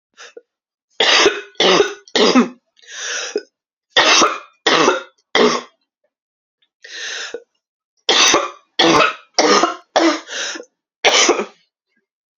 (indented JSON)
{
  "three_cough_length": "12.4 s",
  "three_cough_amplitude": 32768,
  "three_cough_signal_mean_std_ratio": 0.49,
  "survey_phase": "alpha (2021-03-01 to 2021-08-12)",
  "age": "18-44",
  "gender": "Female",
  "wearing_mask": "No",
  "symptom_cough_any": true,
  "symptom_new_continuous_cough": true,
  "symptom_shortness_of_breath": true,
  "symptom_fatigue": true,
  "symptom_fever_high_temperature": true,
  "symptom_headache": true,
  "symptom_change_to_sense_of_smell_or_taste": true,
  "symptom_loss_of_taste": true,
  "symptom_onset": "5 days",
  "smoker_status": "Never smoked",
  "respiratory_condition_asthma": false,
  "respiratory_condition_other": false,
  "recruitment_source": "Test and Trace",
  "submission_delay": "3 days",
  "covid_test_result": "Positive",
  "covid_test_method": "RT-qPCR",
  "covid_ct_value": 16.0,
  "covid_ct_gene": "ORF1ab gene",
  "covid_ct_mean": 16.7,
  "covid_viral_load": "3400000 copies/ml",
  "covid_viral_load_category": "High viral load (>1M copies/ml)"
}